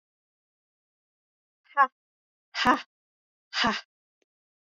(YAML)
exhalation_length: 4.7 s
exhalation_amplitude: 14617
exhalation_signal_mean_std_ratio: 0.24
survey_phase: beta (2021-08-13 to 2022-03-07)
age: 18-44
gender: Female
wearing_mask: 'No'
symptom_cough_any: true
symptom_runny_or_blocked_nose: true
symptom_shortness_of_breath: true
symptom_fatigue: true
symptom_headache: true
smoker_status: Never smoked
respiratory_condition_asthma: true
respiratory_condition_other: false
recruitment_source: Test and Trace
submission_delay: 1 day
covid_test_result: Positive
covid_test_method: LFT